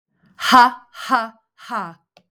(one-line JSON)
{"exhalation_length": "2.3 s", "exhalation_amplitude": 32766, "exhalation_signal_mean_std_ratio": 0.37, "survey_phase": "beta (2021-08-13 to 2022-03-07)", "age": "45-64", "gender": "Female", "wearing_mask": "No", "symptom_cough_any": true, "symptom_runny_or_blocked_nose": true, "symptom_fatigue": true, "symptom_headache": true, "smoker_status": "Ex-smoker", "respiratory_condition_asthma": false, "respiratory_condition_other": false, "recruitment_source": "Test and Trace", "submission_delay": "2 days", "covid_test_result": "Positive", "covid_test_method": "RT-qPCR"}